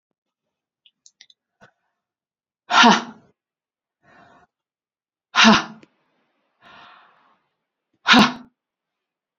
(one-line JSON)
{"exhalation_length": "9.4 s", "exhalation_amplitude": 32767, "exhalation_signal_mean_std_ratio": 0.24, "survey_phase": "beta (2021-08-13 to 2022-03-07)", "age": "45-64", "gender": "Female", "wearing_mask": "No", "symptom_runny_or_blocked_nose": true, "smoker_status": "Never smoked", "respiratory_condition_asthma": false, "respiratory_condition_other": false, "recruitment_source": "REACT", "submission_delay": "6 days", "covid_test_result": "Negative", "covid_test_method": "RT-qPCR", "influenza_a_test_result": "Negative", "influenza_b_test_result": "Negative"}